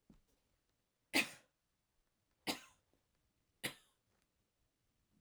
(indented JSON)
{
  "three_cough_length": "5.2 s",
  "three_cough_amplitude": 3208,
  "three_cough_signal_mean_std_ratio": 0.19,
  "survey_phase": "alpha (2021-03-01 to 2021-08-12)",
  "age": "45-64",
  "gender": "Female",
  "wearing_mask": "No",
  "symptom_none": true,
  "smoker_status": "Ex-smoker",
  "respiratory_condition_asthma": true,
  "respiratory_condition_other": false,
  "recruitment_source": "REACT",
  "submission_delay": "1 day",
  "covid_test_result": "Negative",
  "covid_test_method": "RT-qPCR"
}